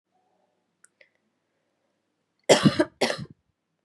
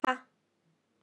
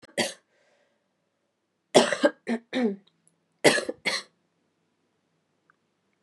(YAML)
cough_length: 3.8 s
cough_amplitude: 26501
cough_signal_mean_std_ratio: 0.24
exhalation_length: 1.0 s
exhalation_amplitude: 10499
exhalation_signal_mean_std_ratio: 0.21
three_cough_length: 6.2 s
three_cough_amplitude: 24551
three_cough_signal_mean_std_ratio: 0.29
survey_phase: beta (2021-08-13 to 2022-03-07)
age: 18-44
gender: Female
wearing_mask: 'No'
symptom_cough_any: true
symptom_runny_or_blocked_nose: true
symptom_abdominal_pain: true
symptom_fatigue: true
symptom_fever_high_temperature: true
symptom_change_to_sense_of_smell_or_taste: true
symptom_onset: 3 days
smoker_status: Never smoked
respiratory_condition_asthma: true
respiratory_condition_other: false
recruitment_source: Test and Trace
submission_delay: 2 days
covid_test_result: Positive
covid_test_method: ePCR